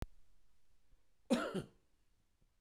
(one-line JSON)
{"cough_length": "2.6 s", "cough_amplitude": 2841, "cough_signal_mean_std_ratio": 0.34, "survey_phase": "beta (2021-08-13 to 2022-03-07)", "age": "45-64", "gender": "Male", "wearing_mask": "No", "symptom_none": true, "smoker_status": "Ex-smoker", "respiratory_condition_asthma": false, "respiratory_condition_other": false, "recruitment_source": "REACT", "submission_delay": "1 day", "covid_test_result": "Negative", "covid_test_method": "RT-qPCR"}